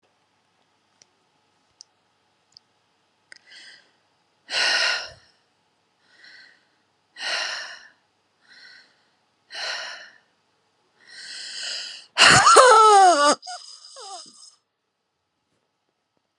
{
  "exhalation_length": "16.4 s",
  "exhalation_amplitude": 32614,
  "exhalation_signal_mean_std_ratio": 0.3,
  "survey_phase": "beta (2021-08-13 to 2022-03-07)",
  "age": "45-64",
  "gender": "Female",
  "wearing_mask": "No",
  "symptom_none": true,
  "smoker_status": "Never smoked",
  "respiratory_condition_asthma": true,
  "respiratory_condition_other": false,
  "recruitment_source": "REACT",
  "submission_delay": "-1 day",
  "covid_test_result": "Negative",
  "covid_test_method": "RT-qPCR",
  "influenza_a_test_result": "Negative",
  "influenza_b_test_result": "Negative"
}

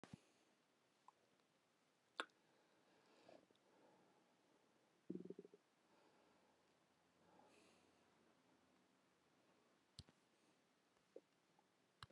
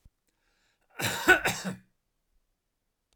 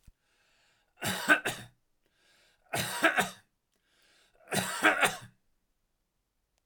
{
  "exhalation_length": "12.1 s",
  "exhalation_amplitude": 1056,
  "exhalation_signal_mean_std_ratio": 0.31,
  "cough_length": "3.2 s",
  "cough_amplitude": 13695,
  "cough_signal_mean_std_ratio": 0.29,
  "three_cough_length": "6.7 s",
  "three_cough_amplitude": 13421,
  "three_cough_signal_mean_std_ratio": 0.35,
  "survey_phase": "alpha (2021-03-01 to 2021-08-12)",
  "age": "65+",
  "gender": "Male",
  "wearing_mask": "No",
  "symptom_none": true,
  "smoker_status": "Never smoked",
  "respiratory_condition_asthma": false,
  "respiratory_condition_other": false,
  "recruitment_source": "REACT",
  "submission_delay": "2 days",
  "covid_test_result": "Negative",
  "covid_test_method": "RT-qPCR"
}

